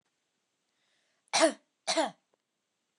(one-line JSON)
{"cough_length": "3.0 s", "cough_amplitude": 8898, "cough_signal_mean_std_ratio": 0.27, "survey_phase": "beta (2021-08-13 to 2022-03-07)", "age": "45-64", "gender": "Female", "wearing_mask": "No", "symptom_none": true, "smoker_status": "Never smoked", "respiratory_condition_asthma": false, "respiratory_condition_other": false, "recruitment_source": "REACT", "submission_delay": "2 days", "covid_test_result": "Negative", "covid_test_method": "RT-qPCR"}